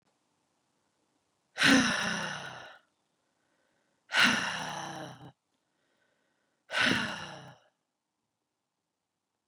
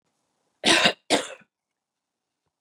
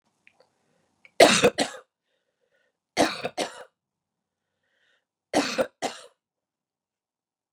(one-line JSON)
{"exhalation_length": "9.5 s", "exhalation_amplitude": 10276, "exhalation_signal_mean_std_ratio": 0.34, "cough_length": "2.6 s", "cough_amplitude": 19856, "cough_signal_mean_std_ratio": 0.3, "three_cough_length": "7.5 s", "three_cough_amplitude": 27710, "three_cough_signal_mean_std_ratio": 0.25, "survey_phase": "beta (2021-08-13 to 2022-03-07)", "age": "45-64", "gender": "Female", "wearing_mask": "No", "symptom_none": true, "smoker_status": "Never smoked", "respiratory_condition_asthma": false, "respiratory_condition_other": false, "recruitment_source": "REACT", "submission_delay": "1 day", "covid_test_result": "Negative", "covid_test_method": "RT-qPCR", "influenza_a_test_result": "Negative", "influenza_b_test_result": "Negative"}